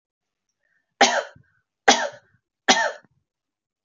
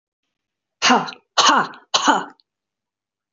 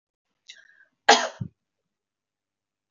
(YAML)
three_cough_length: 3.8 s
three_cough_amplitude: 32291
three_cough_signal_mean_std_ratio: 0.29
exhalation_length: 3.3 s
exhalation_amplitude: 27158
exhalation_signal_mean_std_ratio: 0.39
cough_length: 2.9 s
cough_amplitude: 28267
cough_signal_mean_std_ratio: 0.19
survey_phase: beta (2021-08-13 to 2022-03-07)
age: 45-64
gender: Female
wearing_mask: 'No'
symptom_none: true
smoker_status: Never smoked
respiratory_condition_asthma: false
respiratory_condition_other: false
recruitment_source: REACT
submission_delay: 2 days
covid_test_result: Negative
covid_test_method: RT-qPCR
influenza_a_test_result: Negative
influenza_b_test_result: Negative